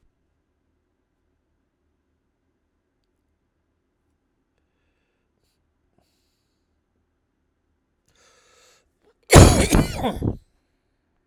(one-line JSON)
{"cough_length": "11.3 s", "cough_amplitude": 32768, "cough_signal_mean_std_ratio": 0.18, "survey_phase": "alpha (2021-03-01 to 2021-08-12)", "age": "45-64", "gender": "Male", "wearing_mask": "No", "symptom_none": true, "smoker_status": "Never smoked", "respiratory_condition_asthma": false, "respiratory_condition_other": false, "recruitment_source": "REACT", "submission_delay": "2 days", "covid_test_result": "Negative", "covid_test_method": "RT-qPCR"}